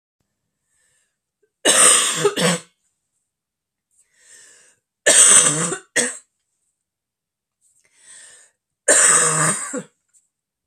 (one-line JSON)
{"three_cough_length": "10.7 s", "three_cough_amplitude": 32768, "three_cough_signal_mean_std_ratio": 0.38, "survey_phase": "beta (2021-08-13 to 2022-03-07)", "age": "18-44", "gender": "Female", "wearing_mask": "No", "symptom_cough_any": true, "symptom_shortness_of_breath": true, "symptom_fatigue": true, "symptom_change_to_sense_of_smell_or_taste": true, "symptom_loss_of_taste": true, "smoker_status": "Never smoked", "respiratory_condition_asthma": false, "respiratory_condition_other": false, "recruitment_source": "Test and Trace", "submission_delay": "2 days", "covid_test_result": "Positive", "covid_test_method": "RT-qPCR"}